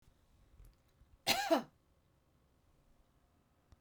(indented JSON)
{
  "cough_length": "3.8 s",
  "cough_amplitude": 5937,
  "cough_signal_mean_std_ratio": 0.25,
  "survey_phase": "beta (2021-08-13 to 2022-03-07)",
  "age": "65+",
  "gender": "Female",
  "wearing_mask": "No",
  "symptom_none": true,
  "smoker_status": "Never smoked",
  "respiratory_condition_asthma": false,
  "respiratory_condition_other": false,
  "recruitment_source": "REACT",
  "submission_delay": "2 days",
  "covid_test_result": "Negative",
  "covid_test_method": "RT-qPCR",
  "influenza_a_test_result": "Negative",
  "influenza_b_test_result": "Negative"
}